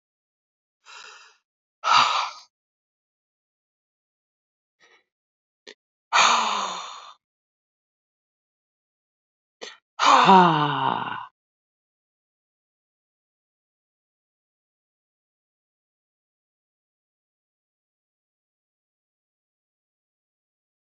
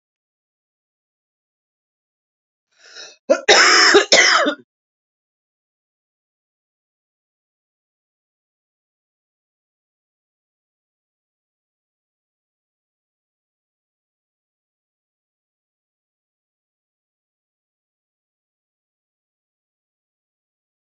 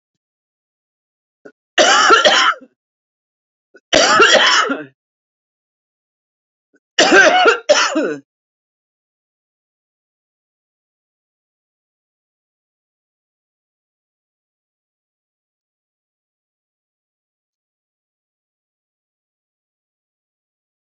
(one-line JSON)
{"exhalation_length": "20.9 s", "exhalation_amplitude": 27684, "exhalation_signal_mean_std_ratio": 0.23, "cough_length": "20.8 s", "cough_amplitude": 31908, "cough_signal_mean_std_ratio": 0.18, "three_cough_length": "20.8 s", "three_cough_amplitude": 30794, "three_cough_signal_mean_std_ratio": 0.28, "survey_phase": "beta (2021-08-13 to 2022-03-07)", "age": "45-64", "gender": "Female", "wearing_mask": "No", "symptom_cough_any": true, "smoker_status": "Current smoker (11 or more cigarettes per day)", "respiratory_condition_asthma": false, "respiratory_condition_other": false, "recruitment_source": "REACT", "submission_delay": "5 days", "covid_test_result": "Negative", "covid_test_method": "RT-qPCR"}